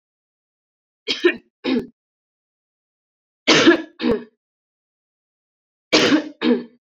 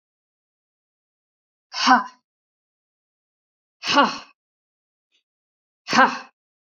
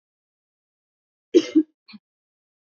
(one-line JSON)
{"three_cough_length": "7.0 s", "three_cough_amplitude": 30603, "three_cough_signal_mean_std_ratio": 0.34, "exhalation_length": "6.7 s", "exhalation_amplitude": 28074, "exhalation_signal_mean_std_ratio": 0.25, "cough_length": "2.6 s", "cough_amplitude": 23467, "cough_signal_mean_std_ratio": 0.2, "survey_phase": "beta (2021-08-13 to 2022-03-07)", "age": "18-44", "gender": "Female", "wearing_mask": "No", "symptom_runny_or_blocked_nose": true, "symptom_sore_throat": true, "symptom_fatigue": true, "symptom_fever_high_temperature": true, "symptom_headache": true, "symptom_onset": "3 days", "smoker_status": "Never smoked", "respiratory_condition_asthma": false, "respiratory_condition_other": false, "recruitment_source": "Test and Trace", "submission_delay": "2 days", "covid_test_result": "Positive", "covid_test_method": "RT-qPCR", "covid_ct_value": 18.8, "covid_ct_gene": "ORF1ab gene"}